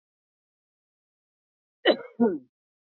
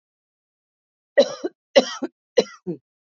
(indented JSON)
{
  "cough_length": "2.9 s",
  "cough_amplitude": 14049,
  "cough_signal_mean_std_ratio": 0.24,
  "three_cough_length": "3.1 s",
  "three_cough_amplitude": 29890,
  "three_cough_signal_mean_std_ratio": 0.26,
  "survey_phase": "beta (2021-08-13 to 2022-03-07)",
  "age": "45-64",
  "gender": "Female",
  "wearing_mask": "No",
  "symptom_none": true,
  "smoker_status": "Never smoked",
  "respiratory_condition_asthma": false,
  "respiratory_condition_other": false,
  "recruitment_source": "REACT",
  "submission_delay": "6 days",
  "covid_test_result": "Negative",
  "covid_test_method": "RT-qPCR",
  "influenza_a_test_result": "Negative",
  "influenza_b_test_result": "Negative"
}